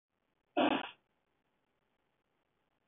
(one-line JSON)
{"cough_length": "2.9 s", "cough_amplitude": 4123, "cough_signal_mean_std_ratio": 0.24, "survey_phase": "beta (2021-08-13 to 2022-03-07)", "age": "45-64", "gender": "Male", "wearing_mask": "No", "symptom_none": true, "smoker_status": "Ex-smoker", "respiratory_condition_asthma": false, "respiratory_condition_other": false, "recruitment_source": "REACT", "submission_delay": "2 days", "covid_test_result": "Negative", "covid_test_method": "RT-qPCR", "influenza_a_test_result": "Unknown/Void", "influenza_b_test_result": "Unknown/Void"}